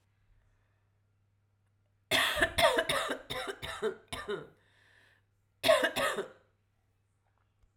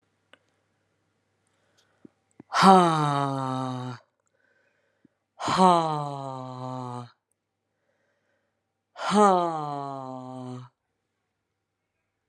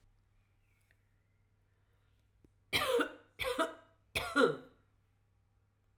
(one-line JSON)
{"cough_length": "7.8 s", "cough_amplitude": 7930, "cough_signal_mean_std_ratio": 0.4, "exhalation_length": "12.3 s", "exhalation_amplitude": 26003, "exhalation_signal_mean_std_ratio": 0.34, "three_cough_length": "6.0 s", "three_cough_amplitude": 5429, "three_cough_signal_mean_std_ratio": 0.33, "survey_phase": "alpha (2021-03-01 to 2021-08-12)", "age": "45-64", "gender": "Female", "wearing_mask": "No", "symptom_cough_any": true, "symptom_fatigue": true, "symptom_fever_high_temperature": true, "symptom_headache": true, "symptom_change_to_sense_of_smell_or_taste": true, "symptom_onset": "4 days", "smoker_status": "Never smoked", "respiratory_condition_asthma": false, "respiratory_condition_other": false, "recruitment_source": "Test and Trace", "submission_delay": "2 days", "covid_test_result": "Positive", "covid_test_method": "RT-qPCR"}